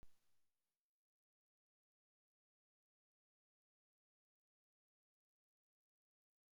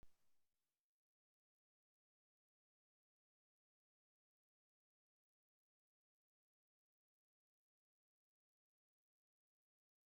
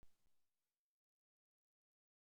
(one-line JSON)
{"exhalation_length": "6.6 s", "exhalation_amplitude": 82, "exhalation_signal_mean_std_ratio": 0.17, "three_cough_length": "10.1 s", "three_cough_amplitude": 60, "three_cough_signal_mean_std_ratio": 0.14, "cough_length": "2.3 s", "cough_amplitude": 59, "cough_signal_mean_std_ratio": 0.31, "survey_phase": "beta (2021-08-13 to 2022-03-07)", "age": "65+", "gender": "Female", "wearing_mask": "No", "symptom_none": true, "smoker_status": "Ex-smoker", "respiratory_condition_asthma": false, "respiratory_condition_other": false, "recruitment_source": "REACT", "submission_delay": "1 day", "covid_test_result": "Negative", "covid_test_method": "RT-qPCR"}